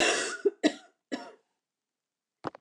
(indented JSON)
{
  "cough_length": "2.6 s",
  "cough_amplitude": 9340,
  "cough_signal_mean_std_ratio": 0.37,
  "survey_phase": "beta (2021-08-13 to 2022-03-07)",
  "age": "45-64",
  "gender": "Female",
  "wearing_mask": "No",
  "symptom_cough_any": true,
  "symptom_runny_or_blocked_nose": true,
  "symptom_sore_throat": true,
  "symptom_fatigue": true,
  "symptom_change_to_sense_of_smell_or_taste": true,
  "symptom_other": true,
  "symptom_onset": "4 days",
  "smoker_status": "Never smoked",
  "respiratory_condition_asthma": false,
  "respiratory_condition_other": false,
  "recruitment_source": "Test and Trace",
  "submission_delay": "2 days",
  "covid_test_result": "Positive",
  "covid_test_method": "RT-qPCR",
  "covid_ct_value": 23.5,
  "covid_ct_gene": "ORF1ab gene"
}